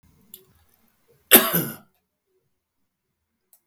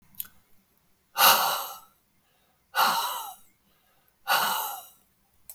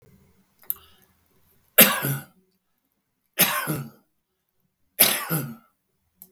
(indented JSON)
{
  "cough_length": "3.7 s",
  "cough_amplitude": 32768,
  "cough_signal_mean_std_ratio": 0.2,
  "exhalation_length": "5.5 s",
  "exhalation_amplitude": 18947,
  "exhalation_signal_mean_std_ratio": 0.4,
  "three_cough_length": "6.3 s",
  "three_cough_amplitude": 32768,
  "three_cough_signal_mean_std_ratio": 0.29,
  "survey_phase": "beta (2021-08-13 to 2022-03-07)",
  "age": "65+",
  "gender": "Male",
  "wearing_mask": "No",
  "symptom_cough_any": true,
  "symptom_shortness_of_breath": true,
  "symptom_sore_throat": true,
  "symptom_fatigue": true,
  "symptom_onset": "11 days",
  "smoker_status": "Ex-smoker",
  "respiratory_condition_asthma": true,
  "respiratory_condition_other": false,
  "recruitment_source": "REACT",
  "submission_delay": "2 days",
  "covid_test_result": "Negative",
  "covid_test_method": "RT-qPCR",
  "influenza_a_test_result": "Negative",
  "influenza_b_test_result": "Negative"
}